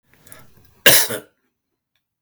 {"cough_length": "2.2 s", "cough_amplitude": 32768, "cough_signal_mean_std_ratio": 0.27, "survey_phase": "beta (2021-08-13 to 2022-03-07)", "age": "45-64", "gender": "Male", "wearing_mask": "No", "symptom_cough_any": true, "symptom_headache": true, "symptom_onset": "4 days", "smoker_status": "Never smoked", "respiratory_condition_asthma": false, "respiratory_condition_other": false, "recruitment_source": "Test and Trace", "submission_delay": "2 days", "covid_test_result": "Negative", "covid_test_method": "RT-qPCR"}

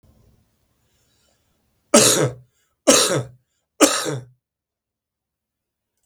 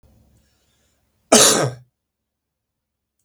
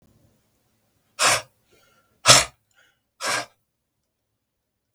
{"three_cough_length": "6.1 s", "three_cough_amplitude": 32766, "three_cough_signal_mean_std_ratio": 0.31, "cough_length": "3.2 s", "cough_amplitude": 32768, "cough_signal_mean_std_ratio": 0.26, "exhalation_length": "4.9 s", "exhalation_amplitude": 32768, "exhalation_signal_mean_std_ratio": 0.24, "survey_phase": "beta (2021-08-13 to 2022-03-07)", "age": "65+", "gender": "Male", "wearing_mask": "No", "symptom_cough_any": true, "symptom_runny_or_blocked_nose": true, "symptom_other": true, "symptom_onset": "5 days", "smoker_status": "Ex-smoker", "respiratory_condition_asthma": true, "respiratory_condition_other": false, "recruitment_source": "Test and Trace", "submission_delay": "2 days", "covid_test_result": "Positive", "covid_test_method": "RT-qPCR"}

